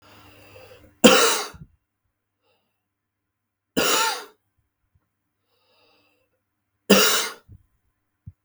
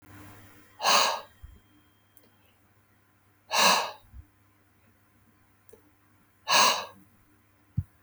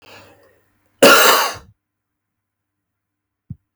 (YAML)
three_cough_length: 8.4 s
three_cough_amplitude: 32768
three_cough_signal_mean_std_ratio: 0.28
exhalation_length: 8.0 s
exhalation_amplitude: 13571
exhalation_signal_mean_std_ratio: 0.32
cough_length: 3.8 s
cough_amplitude: 32768
cough_signal_mean_std_ratio: 0.3
survey_phase: beta (2021-08-13 to 2022-03-07)
age: 45-64
gender: Male
wearing_mask: 'No'
symptom_fatigue: true
smoker_status: Never smoked
respiratory_condition_asthma: false
respiratory_condition_other: false
recruitment_source: REACT
submission_delay: 1 day
covid_test_result: Negative
covid_test_method: RT-qPCR